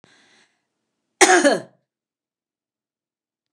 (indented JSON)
{
  "cough_length": "3.5 s",
  "cough_amplitude": 29204,
  "cough_signal_mean_std_ratio": 0.25,
  "survey_phase": "alpha (2021-03-01 to 2021-08-12)",
  "age": "65+",
  "gender": "Female",
  "wearing_mask": "No",
  "symptom_none": true,
  "smoker_status": "Ex-smoker",
  "respiratory_condition_asthma": false,
  "respiratory_condition_other": false,
  "recruitment_source": "REACT",
  "submission_delay": "6 days",
  "covid_test_result": "Negative",
  "covid_test_method": "RT-qPCR"
}